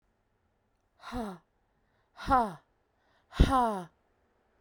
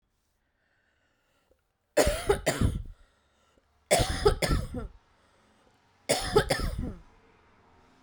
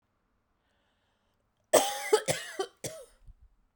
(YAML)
exhalation_length: 4.6 s
exhalation_amplitude: 13838
exhalation_signal_mean_std_ratio: 0.3
three_cough_length: 8.0 s
three_cough_amplitude: 12985
three_cough_signal_mean_std_ratio: 0.4
cough_length: 3.8 s
cough_amplitude: 15271
cough_signal_mean_std_ratio: 0.3
survey_phase: beta (2021-08-13 to 2022-03-07)
age: 18-44
gender: Female
wearing_mask: 'No'
symptom_cough_any: true
symptom_runny_or_blocked_nose: true
symptom_sore_throat: true
symptom_fatigue: true
symptom_headache: true
smoker_status: Ex-smoker
respiratory_condition_asthma: false
respiratory_condition_other: false
recruitment_source: Test and Trace
submission_delay: 1 day
covid_test_result: Positive
covid_test_method: RT-qPCR
covid_ct_value: 19.1
covid_ct_gene: ORF1ab gene
covid_ct_mean: 20.4
covid_viral_load: 210000 copies/ml
covid_viral_load_category: Low viral load (10K-1M copies/ml)